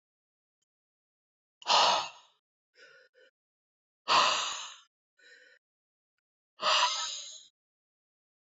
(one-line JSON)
{"exhalation_length": "8.4 s", "exhalation_amplitude": 8517, "exhalation_signal_mean_std_ratio": 0.33, "survey_phase": "beta (2021-08-13 to 2022-03-07)", "age": "18-44", "gender": "Female", "wearing_mask": "No", "symptom_cough_any": true, "symptom_sore_throat": true, "symptom_diarrhoea": true, "symptom_fatigue": true, "symptom_fever_high_temperature": true, "symptom_onset": "2 days", "smoker_status": "Ex-smoker", "respiratory_condition_asthma": false, "respiratory_condition_other": false, "recruitment_source": "Test and Trace", "submission_delay": "1 day", "covid_test_result": "Negative", "covid_test_method": "RT-qPCR"}